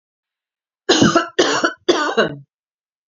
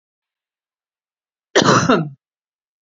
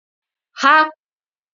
{
  "three_cough_length": "3.1 s",
  "three_cough_amplitude": 32768,
  "three_cough_signal_mean_std_ratio": 0.47,
  "cough_length": "2.8 s",
  "cough_amplitude": 32767,
  "cough_signal_mean_std_ratio": 0.33,
  "exhalation_length": "1.5 s",
  "exhalation_amplitude": 29102,
  "exhalation_signal_mean_std_ratio": 0.32,
  "survey_phase": "alpha (2021-03-01 to 2021-08-12)",
  "age": "18-44",
  "gender": "Female",
  "wearing_mask": "No",
  "symptom_none": true,
  "smoker_status": "Never smoked",
  "respiratory_condition_asthma": false,
  "respiratory_condition_other": false,
  "recruitment_source": "REACT",
  "submission_delay": "2 days",
  "covid_test_result": "Negative",
  "covid_test_method": "RT-qPCR"
}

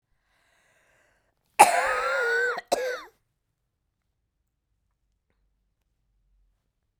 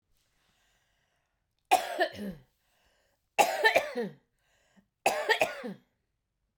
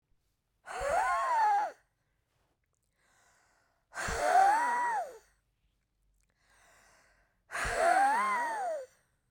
{
  "cough_length": "7.0 s",
  "cough_amplitude": 31419,
  "cough_signal_mean_std_ratio": 0.29,
  "three_cough_length": "6.6 s",
  "three_cough_amplitude": 12350,
  "three_cough_signal_mean_std_ratio": 0.34,
  "exhalation_length": "9.3 s",
  "exhalation_amplitude": 6307,
  "exhalation_signal_mean_std_ratio": 0.53,
  "survey_phase": "beta (2021-08-13 to 2022-03-07)",
  "age": "65+",
  "gender": "Female",
  "wearing_mask": "No",
  "symptom_none": true,
  "smoker_status": "Ex-smoker",
  "respiratory_condition_asthma": false,
  "respiratory_condition_other": false,
  "recruitment_source": "REACT",
  "submission_delay": "2 days",
  "covid_test_result": "Negative",
  "covid_test_method": "RT-qPCR",
  "influenza_a_test_result": "Negative",
  "influenza_b_test_result": "Negative"
}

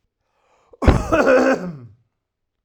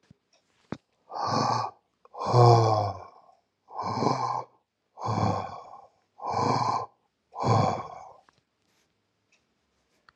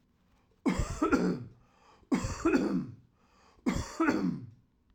{
  "cough_length": "2.6 s",
  "cough_amplitude": 32768,
  "cough_signal_mean_std_ratio": 0.45,
  "exhalation_length": "10.2 s",
  "exhalation_amplitude": 17759,
  "exhalation_signal_mean_std_ratio": 0.45,
  "three_cough_length": "4.9 s",
  "three_cough_amplitude": 6723,
  "three_cough_signal_mean_std_ratio": 0.55,
  "survey_phase": "alpha (2021-03-01 to 2021-08-12)",
  "age": "45-64",
  "gender": "Male",
  "wearing_mask": "No",
  "symptom_none": true,
  "smoker_status": "Ex-smoker",
  "respiratory_condition_asthma": false,
  "respiratory_condition_other": false,
  "recruitment_source": "REACT",
  "submission_delay": "6 days",
  "covid_test_result": "Negative",
  "covid_test_method": "RT-qPCR"
}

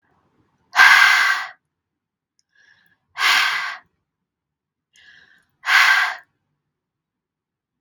{
  "exhalation_length": "7.8 s",
  "exhalation_amplitude": 32767,
  "exhalation_signal_mean_std_ratio": 0.36,
  "survey_phase": "beta (2021-08-13 to 2022-03-07)",
  "age": "18-44",
  "gender": "Female",
  "wearing_mask": "No",
  "symptom_none": true,
  "smoker_status": "Never smoked",
  "respiratory_condition_asthma": true,
  "respiratory_condition_other": false,
  "recruitment_source": "REACT",
  "submission_delay": "4 days",
  "covid_test_result": "Negative",
  "covid_test_method": "RT-qPCR",
  "influenza_a_test_result": "Negative",
  "influenza_b_test_result": "Negative"
}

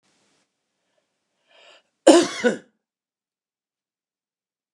{
  "cough_length": "4.7 s",
  "cough_amplitude": 29204,
  "cough_signal_mean_std_ratio": 0.2,
  "survey_phase": "beta (2021-08-13 to 2022-03-07)",
  "age": "65+",
  "gender": "Male",
  "wearing_mask": "No",
  "symptom_none": true,
  "smoker_status": "Ex-smoker",
  "respiratory_condition_asthma": false,
  "respiratory_condition_other": false,
  "recruitment_source": "REACT",
  "submission_delay": "2 days",
  "covid_test_result": "Negative",
  "covid_test_method": "RT-qPCR",
  "influenza_a_test_result": "Negative",
  "influenza_b_test_result": "Negative"
}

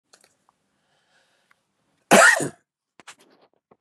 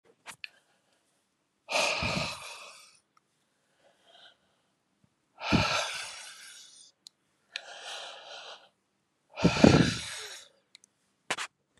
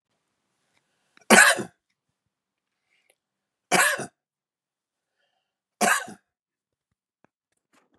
{
  "cough_length": "3.8 s",
  "cough_amplitude": 30996,
  "cough_signal_mean_std_ratio": 0.23,
  "exhalation_length": "11.8 s",
  "exhalation_amplitude": 22655,
  "exhalation_signal_mean_std_ratio": 0.31,
  "three_cough_length": "8.0 s",
  "three_cough_amplitude": 32558,
  "three_cough_signal_mean_std_ratio": 0.23,
  "survey_phase": "beta (2021-08-13 to 2022-03-07)",
  "age": "45-64",
  "gender": "Male",
  "wearing_mask": "No",
  "symptom_none": true,
  "smoker_status": "Current smoker (e-cigarettes or vapes only)",
  "respiratory_condition_asthma": false,
  "respiratory_condition_other": false,
  "recruitment_source": "REACT",
  "submission_delay": "1 day",
  "covid_test_result": "Negative",
  "covid_test_method": "RT-qPCR",
  "influenza_a_test_result": "Negative",
  "influenza_b_test_result": "Negative"
}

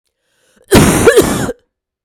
{
  "cough_length": "2.0 s",
  "cough_amplitude": 32768,
  "cough_signal_mean_std_ratio": 0.51,
  "survey_phase": "beta (2021-08-13 to 2022-03-07)",
  "age": "45-64",
  "gender": "Female",
  "wearing_mask": "No",
  "symptom_cough_any": true,
  "symptom_runny_or_blocked_nose": true,
  "symptom_sore_throat": true,
  "symptom_change_to_sense_of_smell_or_taste": true,
  "symptom_loss_of_taste": true,
  "symptom_onset": "6 days",
  "smoker_status": "Never smoked",
  "respiratory_condition_asthma": false,
  "respiratory_condition_other": false,
  "recruitment_source": "Test and Trace",
  "submission_delay": "2 days",
  "covid_test_result": "Positive",
  "covid_test_method": "RT-qPCR"
}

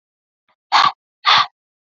{
  "exhalation_length": "1.9 s",
  "exhalation_amplitude": 29646,
  "exhalation_signal_mean_std_ratio": 0.36,
  "survey_phase": "beta (2021-08-13 to 2022-03-07)",
  "age": "18-44",
  "gender": "Female",
  "wearing_mask": "Yes",
  "symptom_runny_or_blocked_nose": true,
  "symptom_sore_throat": true,
  "symptom_onset": "4 days",
  "smoker_status": "Never smoked",
  "respiratory_condition_asthma": false,
  "respiratory_condition_other": false,
  "recruitment_source": "REACT",
  "submission_delay": "1 day",
  "covid_test_result": "Negative",
  "covid_test_method": "RT-qPCR",
  "influenza_a_test_result": "Negative",
  "influenza_b_test_result": "Negative"
}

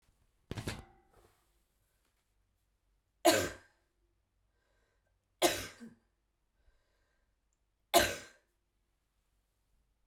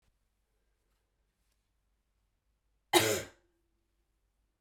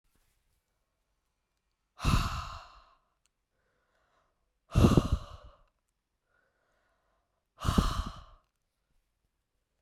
{
  "three_cough_length": "10.1 s",
  "three_cough_amplitude": 11053,
  "three_cough_signal_mean_std_ratio": 0.21,
  "cough_length": "4.6 s",
  "cough_amplitude": 13673,
  "cough_signal_mean_std_ratio": 0.19,
  "exhalation_length": "9.8 s",
  "exhalation_amplitude": 12248,
  "exhalation_signal_mean_std_ratio": 0.26,
  "survey_phase": "beta (2021-08-13 to 2022-03-07)",
  "age": "18-44",
  "gender": "Female",
  "wearing_mask": "No",
  "symptom_cough_any": true,
  "symptom_headache": true,
  "symptom_change_to_sense_of_smell_or_taste": true,
  "symptom_other": true,
  "symptom_onset": "3 days",
  "smoker_status": "Never smoked",
  "respiratory_condition_asthma": false,
  "respiratory_condition_other": false,
  "recruitment_source": "Test and Trace",
  "submission_delay": "2 days",
  "covid_test_result": "Positive",
  "covid_test_method": "RT-qPCR",
  "covid_ct_value": 16.0,
  "covid_ct_gene": "ORF1ab gene",
  "covid_ct_mean": 16.3,
  "covid_viral_load": "4400000 copies/ml",
  "covid_viral_load_category": "High viral load (>1M copies/ml)"
}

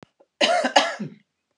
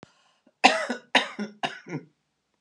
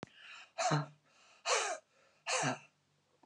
{
  "cough_length": "1.6 s",
  "cough_amplitude": 29540,
  "cough_signal_mean_std_ratio": 0.46,
  "three_cough_length": "2.6 s",
  "three_cough_amplitude": 28791,
  "three_cough_signal_mean_std_ratio": 0.32,
  "exhalation_length": "3.3 s",
  "exhalation_amplitude": 3696,
  "exhalation_signal_mean_std_ratio": 0.47,
  "survey_phase": "beta (2021-08-13 to 2022-03-07)",
  "age": "65+",
  "gender": "Female",
  "wearing_mask": "No",
  "symptom_none": true,
  "smoker_status": "Never smoked",
  "respiratory_condition_asthma": false,
  "respiratory_condition_other": false,
  "recruitment_source": "REACT",
  "submission_delay": "8 days",
  "covid_test_result": "Negative",
  "covid_test_method": "RT-qPCR"
}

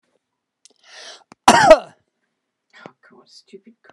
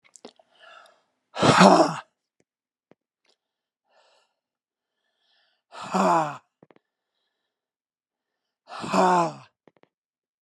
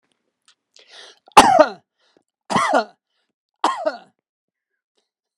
{
  "cough_length": "3.9 s",
  "cough_amplitude": 32768,
  "cough_signal_mean_std_ratio": 0.23,
  "exhalation_length": "10.4 s",
  "exhalation_amplitude": 29911,
  "exhalation_signal_mean_std_ratio": 0.28,
  "three_cough_length": "5.4 s",
  "three_cough_amplitude": 32768,
  "three_cough_signal_mean_std_ratio": 0.28,
  "survey_phase": "beta (2021-08-13 to 2022-03-07)",
  "age": "65+",
  "gender": "Male",
  "wearing_mask": "No",
  "symptom_none": true,
  "smoker_status": "Never smoked",
  "respiratory_condition_asthma": false,
  "respiratory_condition_other": false,
  "recruitment_source": "REACT",
  "submission_delay": "2 days",
  "covid_test_result": "Negative",
  "covid_test_method": "RT-qPCR",
  "influenza_a_test_result": "Negative",
  "influenza_b_test_result": "Negative"
}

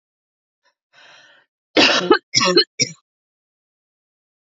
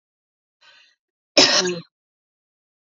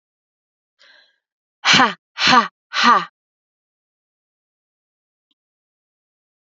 {
  "three_cough_length": "4.5 s",
  "three_cough_amplitude": 31014,
  "three_cough_signal_mean_std_ratio": 0.31,
  "cough_length": "3.0 s",
  "cough_amplitude": 31768,
  "cough_signal_mean_std_ratio": 0.26,
  "exhalation_length": "6.6 s",
  "exhalation_amplitude": 30277,
  "exhalation_signal_mean_std_ratio": 0.27,
  "survey_phase": "beta (2021-08-13 to 2022-03-07)",
  "age": "18-44",
  "gender": "Female",
  "wearing_mask": "No",
  "symptom_cough_any": true,
  "symptom_runny_or_blocked_nose": true,
  "symptom_headache": true,
  "symptom_onset": "5 days",
  "smoker_status": "Never smoked",
  "respiratory_condition_asthma": false,
  "respiratory_condition_other": false,
  "recruitment_source": "Test and Trace",
  "submission_delay": "3 days",
  "covid_test_result": "Positive",
  "covid_test_method": "RT-qPCR",
  "covid_ct_value": 15.4,
  "covid_ct_gene": "ORF1ab gene",
  "covid_ct_mean": 15.6,
  "covid_viral_load": "7600000 copies/ml",
  "covid_viral_load_category": "High viral load (>1M copies/ml)"
}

